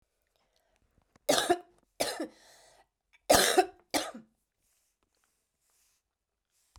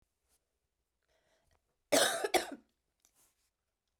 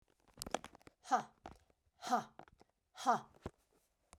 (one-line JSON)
{"three_cough_length": "6.8 s", "three_cough_amplitude": 12425, "three_cough_signal_mean_std_ratio": 0.27, "cough_length": "4.0 s", "cough_amplitude": 7111, "cough_signal_mean_std_ratio": 0.26, "exhalation_length": "4.2 s", "exhalation_amplitude": 3752, "exhalation_signal_mean_std_ratio": 0.29, "survey_phase": "beta (2021-08-13 to 2022-03-07)", "age": "45-64", "gender": "Female", "wearing_mask": "No", "symptom_cough_any": true, "symptom_runny_or_blocked_nose": true, "symptom_fatigue": true, "symptom_headache": true, "symptom_change_to_sense_of_smell_or_taste": true, "smoker_status": "Never smoked", "respiratory_condition_asthma": true, "respiratory_condition_other": false, "recruitment_source": "Test and Trace", "submission_delay": "2 days", "covid_test_result": "Positive", "covid_test_method": "RT-qPCR", "covid_ct_value": 16.3, "covid_ct_gene": "ORF1ab gene", "covid_ct_mean": 16.7, "covid_viral_load": "3300000 copies/ml", "covid_viral_load_category": "High viral load (>1M copies/ml)"}